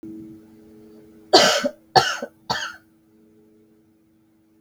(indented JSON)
{
  "three_cough_length": "4.6 s",
  "three_cough_amplitude": 32768,
  "three_cough_signal_mean_std_ratio": 0.31,
  "survey_phase": "beta (2021-08-13 to 2022-03-07)",
  "age": "45-64",
  "gender": "Female",
  "wearing_mask": "No",
  "symptom_cough_any": true,
  "symptom_runny_or_blocked_nose": true,
  "symptom_headache": true,
  "symptom_change_to_sense_of_smell_or_taste": true,
  "symptom_other": true,
  "symptom_onset": "7 days",
  "smoker_status": "Never smoked",
  "respiratory_condition_asthma": false,
  "respiratory_condition_other": false,
  "recruitment_source": "Test and Trace",
  "submission_delay": "1 day",
  "covid_test_result": "Positive",
  "covid_test_method": "RT-qPCR",
  "covid_ct_value": 15.4,
  "covid_ct_gene": "ORF1ab gene",
  "covid_ct_mean": 16.9,
  "covid_viral_load": "2800000 copies/ml",
  "covid_viral_load_category": "High viral load (>1M copies/ml)"
}